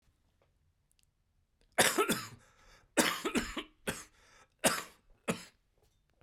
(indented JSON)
{
  "three_cough_length": "6.2 s",
  "three_cough_amplitude": 9563,
  "three_cough_signal_mean_std_ratio": 0.34,
  "survey_phase": "beta (2021-08-13 to 2022-03-07)",
  "age": "45-64",
  "gender": "Male",
  "wearing_mask": "No",
  "symptom_cough_any": true,
  "smoker_status": "Ex-smoker",
  "respiratory_condition_asthma": false,
  "respiratory_condition_other": false,
  "recruitment_source": "Test and Trace",
  "submission_delay": "2 days",
  "covid_test_result": "Positive",
  "covid_test_method": "LFT"
}